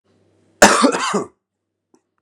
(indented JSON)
{
  "cough_length": "2.2 s",
  "cough_amplitude": 32768,
  "cough_signal_mean_std_ratio": 0.36,
  "survey_phase": "beta (2021-08-13 to 2022-03-07)",
  "age": "45-64",
  "gender": "Male",
  "wearing_mask": "No",
  "symptom_none": true,
  "smoker_status": "Ex-smoker",
  "respiratory_condition_asthma": false,
  "respiratory_condition_other": false,
  "recruitment_source": "REACT",
  "submission_delay": "0 days",
  "covid_test_result": "Negative",
  "covid_test_method": "RT-qPCR",
  "influenza_a_test_result": "Negative",
  "influenza_b_test_result": "Negative"
}